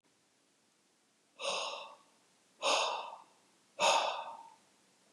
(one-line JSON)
{"exhalation_length": "5.1 s", "exhalation_amplitude": 4793, "exhalation_signal_mean_std_ratio": 0.41, "survey_phase": "beta (2021-08-13 to 2022-03-07)", "age": "45-64", "gender": "Male", "wearing_mask": "No", "symptom_none": true, "smoker_status": "Never smoked", "respiratory_condition_asthma": false, "respiratory_condition_other": false, "recruitment_source": "REACT", "submission_delay": "2 days", "covid_test_result": "Negative", "covid_test_method": "RT-qPCR", "influenza_a_test_result": "Negative", "influenza_b_test_result": "Negative"}